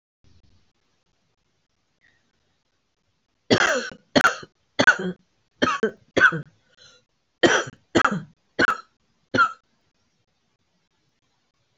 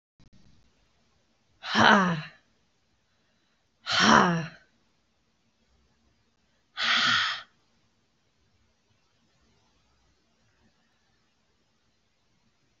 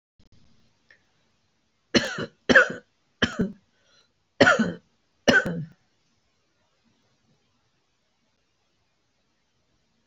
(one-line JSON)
{"three_cough_length": "11.8 s", "three_cough_amplitude": 27636, "three_cough_signal_mean_std_ratio": 0.3, "exhalation_length": "12.8 s", "exhalation_amplitude": 24100, "exhalation_signal_mean_std_ratio": 0.28, "cough_length": "10.1 s", "cough_amplitude": 29358, "cough_signal_mean_std_ratio": 0.25, "survey_phase": "beta (2021-08-13 to 2022-03-07)", "age": "65+", "gender": "Female", "wearing_mask": "No", "symptom_cough_any": true, "symptom_shortness_of_breath": true, "symptom_fatigue": true, "symptom_headache": true, "symptom_other": true, "symptom_onset": "9 days", "smoker_status": "Never smoked", "respiratory_condition_asthma": true, "respiratory_condition_other": false, "recruitment_source": "Test and Trace", "submission_delay": "3 days", "covid_test_result": "Negative", "covid_test_method": "RT-qPCR"}